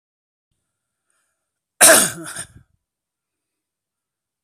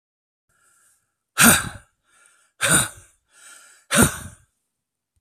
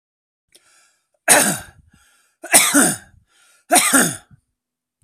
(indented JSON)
{
  "cough_length": "4.4 s",
  "cough_amplitude": 32768,
  "cough_signal_mean_std_ratio": 0.21,
  "exhalation_length": "5.2 s",
  "exhalation_amplitude": 32768,
  "exhalation_signal_mean_std_ratio": 0.3,
  "three_cough_length": "5.0 s",
  "three_cough_amplitude": 32768,
  "three_cough_signal_mean_std_ratio": 0.37,
  "survey_phase": "beta (2021-08-13 to 2022-03-07)",
  "age": "45-64",
  "gender": "Male",
  "wearing_mask": "No",
  "symptom_cough_any": true,
  "symptom_shortness_of_breath": true,
  "symptom_onset": "10 days",
  "smoker_status": "Ex-smoker",
  "respiratory_condition_asthma": false,
  "respiratory_condition_other": true,
  "recruitment_source": "REACT",
  "submission_delay": "2 days",
  "covid_test_result": "Negative",
  "covid_test_method": "RT-qPCR",
  "influenza_a_test_result": "Negative",
  "influenza_b_test_result": "Negative"
}